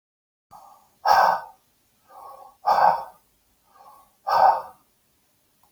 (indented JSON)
{
  "exhalation_length": "5.7 s",
  "exhalation_amplitude": 21511,
  "exhalation_signal_mean_std_ratio": 0.36,
  "survey_phase": "beta (2021-08-13 to 2022-03-07)",
  "age": "65+",
  "gender": "Male",
  "wearing_mask": "No",
  "symptom_none": true,
  "smoker_status": "Ex-smoker",
  "respiratory_condition_asthma": true,
  "respiratory_condition_other": false,
  "recruitment_source": "REACT",
  "submission_delay": "3 days",
  "covid_test_result": "Negative",
  "covid_test_method": "RT-qPCR",
  "influenza_a_test_result": "Negative",
  "influenza_b_test_result": "Negative"
}